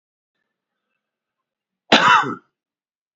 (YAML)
cough_length: 3.2 s
cough_amplitude: 29589
cough_signal_mean_std_ratio: 0.27
survey_phase: beta (2021-08-13 to 2022-03-07)
age: 45-64
gender: Male
wearing_mask: 'No'
symptom_none: true
smoker_status: Ex-smoker
respiratory_condition_asthma: false
respiratory_condition_other: false
recruitment_source: REACT
submission_delay: 2 days
covid_test_result: Negative
covid_test_method: RT-qPCR